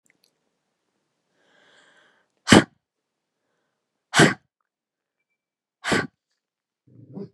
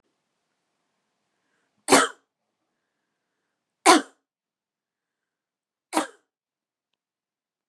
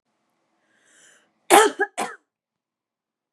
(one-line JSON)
{"exhalation_length": "7.3 s", "exhalation_amplitude": 32768, "exhalation_signal_mean_std_ratio": 0.18, "three_cough_length": "7.7 s", "three_cough_amplitude": 29575, "three_cough_signal_mean_std_ratio": 0.17, "cough_length": "3.3 s", "cough_amplitude": 32768, "cough_signal_mean_std_ratio": 0.23, "survey_phase": "beta (2021-08-13 to 2022-03-07)", "age": "18-44", "gender": "Female", "wearing_mask": "No", "symptom_none": true, "smoker_status": "Ex-smoker", "respiratory_condition_asthma": false, "respiratory_condition_other": false, "recruitment_source": "REACT", "submission_delay": "2 days", "covid_test_result": "Negative", "covid_test_method": "RT-qPCR", "influenza_a_test_result": "Negative", "influenza_b_test_result": "Negative"}